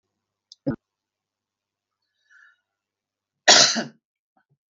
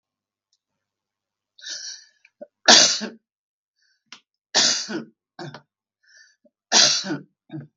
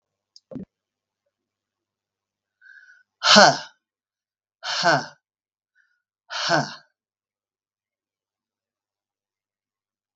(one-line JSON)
{"cough_length": "4.7 s", "cough_amplitude": 32768, "cough_signal_mean_std_ratio": 0.21, "three_cough_length": "7.8 s", "three_cough_amplitude": 32768, "three_cough_signal_mean_std_ratio": 0.29, "exhalation_length": "10.2 s", "exhalation_amplitude": 32768, "exhalation_signal_mean_std_ratio": 0.22, "survey_phase": "beta (2021-08-13 to 2022-03-07)", "age": "65+", "gender": "Female", "wearing_mask": "No", "symptom_cough_any": true, "symptom_shortness_of_breath": true, "smoker_status": "Never smoked", "respiratory_condition_asthma": false, "respiratory_condition_other": false, "recruitment_source": "REACT", "submission_delay": "1 day", "covid_test_result": "Negative", "covid_test_method": "RT-qPCR"}